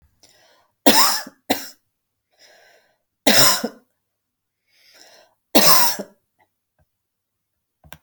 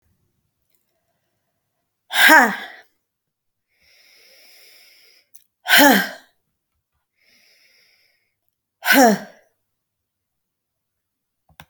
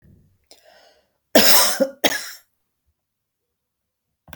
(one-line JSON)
{"three_cough_length": "8.0 s", "three_cough_amplitude": 32768, "three_cough_signal_mean_std_ratio": 0.3, "exhalation_length": "11.7 s", "exhalation_amplitude": 32768, "exhalation_signal_mean_std_ratio": 0.25, "cough_length": "4.4 s", "cough_amplitude": 32768, "cough_signal_mean_std_ratio": 0.3, "survey_phase": "beta (2021-08-13 to 2022-03-07)", "age": "65+", "gender": "Female", "wearing_mask": "No", "symptom_none": true, "smoker_status": "Ex-smoker", "respiratory_condition_asthma": false, "respiratory_condition_other": false, "recruitment_source": "REACT", "submission_delay": "2 days", "covid_test_result": "Negative", "covid_test_method": "RT-qPCR"}